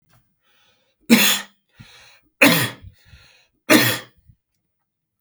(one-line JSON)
{"three_cough_length": "5.2 s", "three_cough_amplitude": 32768, "three_cough_signal_mean_std_ratio": 0.32, "survey_phase": "beta (2021-08-13 to 2022-03-07)", "age": "45-64", "gender": "Male", "wearing_mask": "No", "symptom_none": true, "smoker_status": "Never smoked", "respiratory_condition_asthma": false, "respiratory_condition_other": false, "recruitment_source": "REACT", "submission_delay": "1 day", "covid_test_result": "Negative", "covid_test_method": "RT-qPCR", "influenza_a_test_result": "Negative", "influenza_b_test_result": "Negative"}